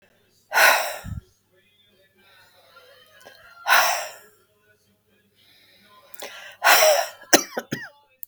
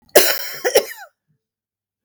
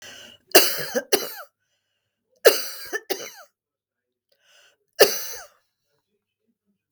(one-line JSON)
{"exhalation_length": "8.3 s", "exhalation_amplitude": 32768, "exhalation_signal_mean_std_ratio": 0.34, "cough_length": "2.0 s", "cough_amplitude": 32768, "cough_signal_mean_std_ratio": 0.36, "three_cough_length": "6.9 s", "three_cough_amplitude": 32768, "three_cough_signal_mean_std_ratio": 0.27, "survey_phase": "beta (2021-08-13 to 2022-03-07)", "age": "65+", "gender": "Female", "wearing_mask": "No", "symptom_none": true, "symptom_onset": "12 days", "smoker_status": "Ex-smoker", "respiratory_condition_asthma": false, "respiratory_condition_other": false, "recruitment_source": "REACT", "submission_delay": "2 days", "covid_test_result": "Negative", "covid_test_method": "RT-qPCR", "influenza_a_test_result": "Negative", "influenza_b_test_result": "Negative"}